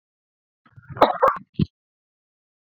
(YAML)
cough_length: 2.6 s
cough_amplitude: 29588
cough_signal_mean_std_ratio: 0.26
survey_phase: beta (2021-08-13 to 2022-03-07)
age: 45-64
gender: Male
wearing_mask: 'No'
symptom_none: true
smoker_status: Never smoked
respiratory_condition_asthma: false
respiratory_condition_other: false
recruitment_source: REACT
submission_delay: 1 day
covid_test_result: Negative
covid_test_method: RT-qPCR